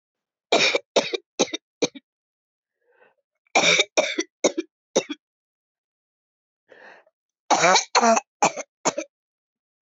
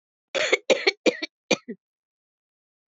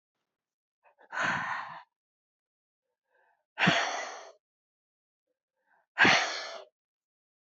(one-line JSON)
{"three_cough_length": "9.8 s", "three_cough_amplitude": 24468, "three_cough_signal_mean_std_ratio": 0.35, "cough_length": "2.9 s", "cough_amplitude": 20385, "cough_signal_mean_std_ratio": 0.31, "exhalation_length": "7.4 s", "exhalation_amplitude": 14400, "exhalation_signal_mean_std_ratio": 0.32, "survey_phase": "beta (2021-08-13 to 2022-03-07)", "age": "45-64", "gender": "Female", "wearing_mask": "No", "symptom_shortness_of_breath": true, "symptom_fatigue": true, "smoker_status": "Never smoked", "respiratory_condition_asthma": false, "respiratory_condition_other": false, "recruitment_source": "REACT", "submission_delay": "1 day", "covid_test_result": "Negative", "covid_test_method": "RT-qPCR"}